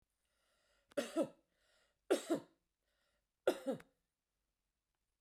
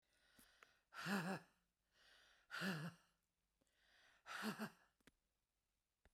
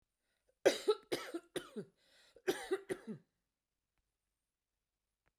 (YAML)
three_cough_length: 5.2 s
three_cough_amplitude: 2794
three_cough_signal_mean_std_ratio: 0.26
exhalation_length: 6.1 s
exhalation_amplitude: 931
exhalation_signal_mean_std_ratio: 0.39
cough_length: 5.4 s
cough_amplitude: 6198
cough_signal_mean_std_ratio: 0.27
survey_phase: beta (2021-08-13 to 2022-03-07)
age: 65+
gender: Female
wearing_mask: 'No'
symptom_none: true
smoker_status: Ex-smoker
respiratory_condition_asthma: true
respiratory_condition_other: false
recruitment_source: REACT
submission_delay: 1 day
covid_test_result: Negative
covid_test_method: RT-qPCR
influenza_a_test_result: Negative
influenza_b_test_result: Negative